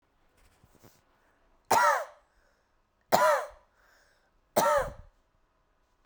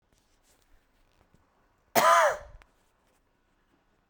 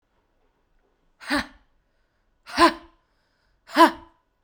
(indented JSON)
{
  "three_cough_length": "6.1 s",
  "three_cough_amplitude": 16847,
  "three_cough_signal_mean_std_ratio": 0.33,
  "cough_length": "4.1 s",
  "cough_amplitude": 14963,
  "cough_signal_mean_std_ratio": 0.26,
  "exhalation_length": "4.4 s",
  "exhalation_amplitude": 25104,
  "exhalation_signal_mean_std_ratio": 0.24,
  "survey_phase": "beta (2021-08-13 to 2022-03-07)",
  "age": "18-44",
  "gender": "Female",
  "wearing_mask": "No",
  "symptom_cough_any": true,
  "symptom_headache": true,
  "symptom_onset": "7 days",
  "smoker_status": "Never smoked",
  "respiratory_condition_asthma": true,
  "respiratory_condition_other": false,
  "recruitment_source": "REACT",
  "submission_delay": "1 day",
  "covid_test_result": "Negative",
  "covid_test_method": "RT-qPCR"
}